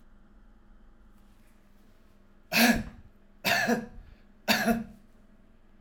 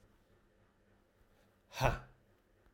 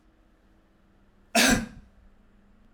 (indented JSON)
{
  "three_cough_length": "5.8 s",
  "three_cough_amplitude": 11002,
  "three_cough_signal_mean_std_ratio": 0.39,
  "exhalation_length": "2.7 s",
  "exhalation_amplitude": 4826,
  "exhalation_signal_mean_std_ratio": 0.24,
  "cough_length": "2.7 s",
  "cough_amplitude": 13344,
  "cough_signal_mean_std_ratio": 0.29,
  "survey_phase": "alpha (2021-03-01 to 2021-08-12)",
  "age": "45-64",
  "gender": "Male",
  "wearing_mask": "No",
  "symptom_fatigue": true,
  "symptom_headache": true,
  "smoker_status": "Never smoked",
  "respiratory_condition_asthma": false,
  "respiratory_condition_other": false,
  "recruitment_source": "Test and Trace",
  "submission_delay": "1 day",
  "covid_test_result": "Positive",
  "covid_test_method": "RT-qPCR"
}